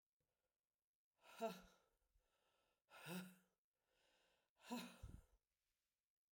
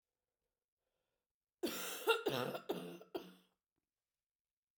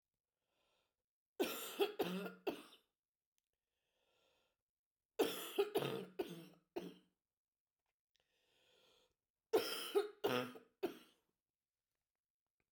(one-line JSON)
{"exhalation_length": "6.3 s", "exhalation_amplitude": 593, "exhalation_signal_mean_std_ratio": 0.31, "cough_length": "4.8 s", "cough_amplitude": 3216, "cough_signal_mean_std_ratio": 0.36, "three_cough_length": "12.7 s", "three_cough_amplitude": 2322, "three_cough_signal_mean_std_ratio": 0.34, "survey_phase": "beta (2021-08-13 to 2022-03-07)", "age": "45-64", "gender": "Female", "wearing_mask": "No", "symptom_cough_any": true, "symptom_runny_or_blocked_nose": true, "symptom_shortness_of_breath": true, "symptom_abdominal_pain": true, "symptom_fatigue": true, "symptom_loss_of_taste": true, "symptom_other": true, "smoker_status": "Never smoked", "respiratory_condition_asthma": false, "respiratory_condition_other": false, "recruitment_source": "Test and Trace", "submission_delay": "4 days", "covid_test_result": "Positive", "covid_test_method": "RT-qPCR", "covid_ct_value": 22.2, "covid_ct_gene": "ORF1ab gene", "covid_ct_mean": 23.1, "covid_viral_load": "27000 copies/ml", "covid_viral_load_category": "Low viral load (10K-1M copies/ml)"}